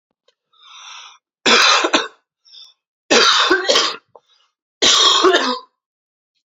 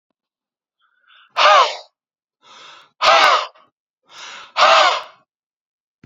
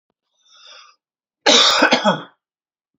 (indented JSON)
{
  "three_cough_length": "6.6 s",
  "three_cough_amplitude": 31820,
  "three_cough_signal_mean_std_ratio": 0.48,
  "exhalation_length": "6.1 s",
  "exhalation_amplitude": 32768,
  "exhalation_signal_mean_std_ratio": 0.38,
  "cough_length": "3.0 s",
  "cough_amplitude": 31535,
  "cough_signal_mean_std_ratio": 0.39,
  "survey_phase": "beta (2021-08-13 to 2022-03-07)",
  "age": "18-44",
  "gender": "Male",
  "wearing_mask": "No",
  "symptom_runny_or_blocked_nose": true,
  "symptom_onset": "2 days",
  "smoker_status": "Never smoked",
  "respiratory_condition_asthma": false,
  "respiratory_condition_other": false,
  "recruitment_source": "Test and Trace",
  "submission_delay": "1 day",
  "covid_test_result": "Positive",
  "covid_test_method": "RT-qPCR",
  "covid_ct_value": 25.7,
  "covid_ct_gene": "ORF1ab gene",
  "covid_ct_mean": 25.9,
  "covid_viral_load": "3100 copies/ml",
  "covid_viral_load_category": "Minimal viral load (< 10K copies/ml)"
}